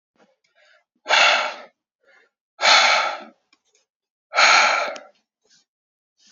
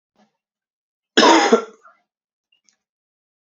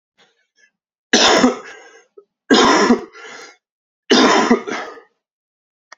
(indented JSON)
{
  "exhalation_length": "6.3 s",
  "exhalation_amplitude": 27530,
  "exhalation_signal_mean_std_ratio": 0.4,
  "cough_length": "3.5 s",
  "cough_amplitude": 31788,
  "cough_signal_mean_std_ratio": 0.28,
  "three_cough_length": "6.0 s",
  "three_cough_amplitude": 30275,
  "three_cough_signal_mean_std_ratio": 0.43,
  "survey_phase": "alpha (2021-03-01 to 2021-08-12)",
  "age": "18-44",
  "gender": "Male",
  "wearing_mask": "No",
  "symptom_cough_any": true,
  "symptom_fatigue": true,
  "symptom_fever_high_temperature": true,
  "symptom_headache": true,
  "symptom_onset": "3 days",
  "smoker_status": "Never smoked",
  "respiratory_condition_asthma": false,
  "respiratory_condition_other": false,
  "recruitment_source": "Test and Trace",
  "submission_delay": "2 days",
  "covid_test_result": "Positive",
  "covid_test_method": "RT-qPCR",
  "covid_ct_value": 32.3,
  "covid_ct_gene": "N gene"
}